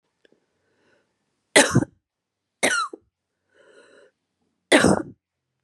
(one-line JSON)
{"three_cough_length": "5.6 s", "three_cough_amplitude": 30619, "three_cough_signal_mean_std_ratio": 0.27, "survey_phase": "beta (2021-08-13 to 2022-03-07)", "age": "18-44", "gender": "Female", "wearing_mask": "No", "symptom_runny_or_blocked_nose": true, "symptom_sore_throat": true, "smoker_status": "Never smoked", "respiratory_condition_asthma": false, "respiratory_condition_other": false, "recruitment_source": "Test and Trace", "submission_delay": "2 days", "covid_test_result": "Positive", "covid_test_method": "RT-qPCR", "covid_ct_value": 28.1, "covid_ct_gene": "ORF1ab gene", "covid_ct_mean": 28.3, "covid_viral_load": "540 copies/ml", "covid_viral_load_category": "Minimal viral load (< 10K copies/ml)"}